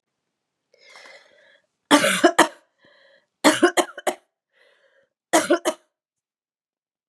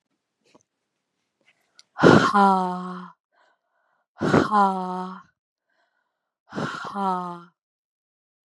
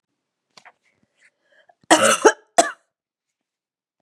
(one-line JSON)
{"three_cough_length": "7.1 s", "three_cough_amplitude": 32334, "three_cough_signal_mean_std_ratio": 0.29, "exhalation_length": "8.4 s", "exhalation_amplitude": 29220, "exhalation_signal_mean_std_ratio": 0.36, "cough_length": "4.0 s", "cough_amplitude": 32768, "cough_signal_mean_std_ratio": 0.24, "survey_phase": "beta (2021-08-13 to 2022-03-07)", "age": "18-44", "gender": "Female", "wearing_mask": "No", "symptom_cough_any": true, "symptom_runny_or_blocked_nose": true, "symptom_sore_throat": true, "symptom_onset": "4 days", "smoker_status": "Never smoked", "respiratory_condition_asthma": false, "respiratory_condition_other": false, "recruitment_source": "Test and Trace", "submission_delay": "1 day", "covid_test_result": "Positive", "covid_test_method": "RT-qPCR", "covid_ct_value": 15.7, "covid_ct_gene": "S gene"}